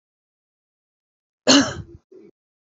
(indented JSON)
{
  "exhalation_length": "2.7 s",
  "exhalation_amplitude": 32767,
  "exhalation_signal_mean_std_ratio": 0.24,
  "survey_phase": "beta (2021-08-13 to 2022-03-07)",
  "age": "45-64",
  "gender": "Female",
  "wearing_mask": "No",
  "symptom_none": true,
  "smoker_status": "Never smoked",
  "respiratory_condition_asthma": true,
  "respiratory_condition_other": false,
  "recruitment_source": "REACT",
  "submission_delay": "9 days",
  "covid_test_result": "Negative",
  "covid_test_method": "RT-qPCR",
  "influenza_a_test_result": "Negative",
  "influenza_b_test_result": "Negative"
}